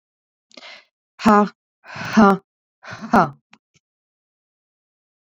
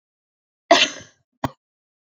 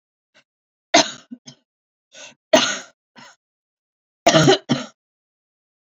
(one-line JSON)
{"exhalation_length": "5.2 s", "exhalation_amplitude": 27822, "exhalation_signal_mean_std_ratio": 0.29, "cough_length": "2.1 s", "cough_amplitude": 28612, "cough_signal_mean_std_ratio": 0.23, "three_cough_length": "5.8 s", "three_cough_amplitude": 31280, "three_cough_signal_mean_std_ratio": 0.28, "survey_phase": "beta (2021-08-13 to 2022-03-07)", "age": "18-44", "gender": "Female", "wearing_mask": "No", "symptom_none": true, "smoker_status": "Current smoker (11 or more cigarettes per day)", "respiratory_condition_asthma": false, "respiratory_condition_other": false, "recruitment_source": "REACT", "submission_delay": "1 day", "covid_test_result": "Negative", "covid_test_method": "RT-qPCR"}